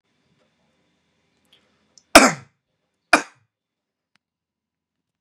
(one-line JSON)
{"cough_length": "5.2 s", "cough_amplitude": 32768, "cough_signal_mean_std_ratio": 0.15, "survey_phase": "beta (2021-08-13 to 2022-03-07)", "age": "18-44", "gender": "Male", "wearing_mask": "No", "symptom_none": true, "smoker_status": "Ex-smoker", "respiratory_condition_asthma": false, "respiratory_condition_other": false, "recruitment_source": "Test and Trace", "submission_delay": "2 days", "covid_test_result": "Positive", "covid_test_method": "RT-qPCR", "covid_ct_value": 22.6, "covid_ct_gene": "ORF1ab gene", "covid_ct_mean": 22.7, "covid_viral_load": "36000 copies/ml", "covid_viral_load_category": "Low viral load (10K-1M copies/ml)"}